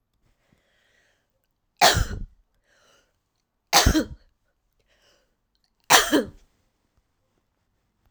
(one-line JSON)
{"three_cough_length": "8.1 s", "three_cough_amplitude": 32768, "three_cough_signal_mean_std_ratio": 0.26, "survey_phase": "alpha (2021-03-01 to 2021-08-12)", "age": "45-64", "gender": "Female", "wearing_mask": "No", "symptom_none": true, "smoker_status": "Never smoked", "respiratory_condition_asthma": false, "respiratory_condition_other": false, "recruitment_source": "REACT", "submission_delay": "2 days", "covid_test_result": "Negative", "covid_test_method": "RT-qPCR"}